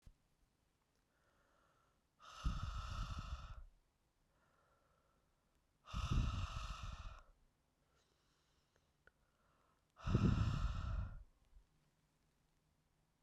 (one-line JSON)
{"exhalation_length": "13.2 s", "exhalation_amplitude": 2434, "exhalation_signal_mean_std_ratio": 0.39, "survey_phase": "beta (2021-08-13 to 2022-03-07)", "age": "18-44", "gender": "Female", "wearing_mask": "No", "symptom_cough_any": true, "symptom_new_continuous_cough": true, "symptom_change_to_sense_of_smell_or_taste": true, "symptom_loss_of_taste": true, "smoker_status": "Never smoked", "respiratory_condition_asthma": false, "respiratory_condition_other": false, "recruitment_source": "Test and Trace", "submission_delay": "2 days", "covid_test_result": "Positive", "covid_test_method": "LFT"}